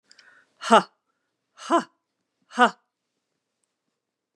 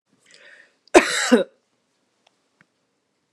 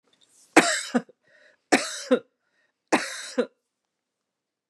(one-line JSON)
{"exhalation_length": "4.4 s", "exhalation_amplitude": 29256, "exhalation_signal_mean_std_ratio": 0.21, "cough_length": "3.3 s", "cough_amplitude": 32767, "cough_signal_mean_std_ratio": 0.24, "three_cough_length": "4.7 s", "three_cough_amplitude": 29892, "three_cough_signal_mean_std_ratio": 0.3, "survey_phase": "beta (2021-08-13 to 2022-03-07)", "age": "65+", "gender": "Female", "wearing_mask": "No", "symptom_cough_any": true, "smoker_status": "Ex-smoker", "respiratory_condition_asthma": false, "respiratory_condition_other": false, "recruitment_source": "REACT", "submission_delay": "2 days", "covid_test_result": "Positive", "covid_test_method": "RT-qPCR", "covid_ct_value": 36.6, "covid_ct_gene": "N gene", "influenza_a_test_result": "Negative", "influenza_b_test_result": "Negative"}